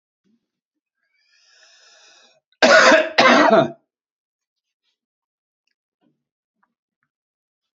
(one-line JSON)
{"cough_length": "7.8 s", "cough_amplitude": 30040, "cough_signal_mean_std_ratio": 0.28, "survey_phase": "beta (2021-08-13 to 2022-03-07)", "age": "65+", "gender": "Male", "wearing_mask": "No", "symptom_cough_any": true, "smoker_status": "Never smoked", "respiratory_condition_asthma": false, "respiratory_condition_other": false, "recruitment_source": "REACT", "submission_delay": "2 days", "covid_test_result": "Negative", "covid_test_method": "RT-qPCR", "influenza_a_test_result": "Negative", "influenza_b_test_result": "Negative"}